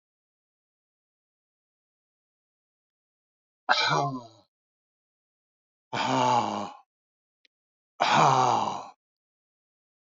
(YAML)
exhalation_length: 10.1 s
exhalation_amplitude: 19203
exhalation_signal_mean_std_ratio: 0.34
survey_phase: beta (2021-08-13 to 2022-03-07)
age: 65+
gender: Male
wearing_mask: 'No'
symptom_none: true
smoker_status: Ex-smoker
respiratory_condition_asthma: false
respiratory_condition_other: false
recruitment_source: REACT
submission_delay: 2 days
covid_test_result: Negative
covid_test_method: RT-qPCR
influenza_a_test_result: Negative
influenza_b_test_result: Negative